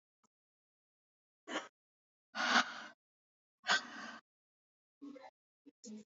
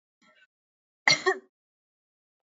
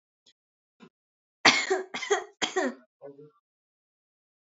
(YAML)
exhalation_length: 6.1 s
exhalation_amplitude: 4975
exhalation_signal_mean_std_ratio: 0.28
cough_length: 2.6 s
cough_amplitude: 18696
cough_signal_mean_std_ratio: 0.21
three_cough_length: 4.5 s
three_cough_amplitude: 23581
three_cough_signal_mean_std_ratio: 0.3
survey_phase: beta (2021-08-13 to 2022-03-07)
age: 18-44
gender: Female
wearing_mask: 'No'
symptom_none: true
smoker_status: Never smoked
respiratory_condition_asthma: true
respiratory_condition_other: false
recruitment_source: REACT
submission_delay: 3 days
covid_test_result: Negative
covid_test_method: RT-qPCR
influenza_a_test_result: Negative
influenza_b_test_result: Negative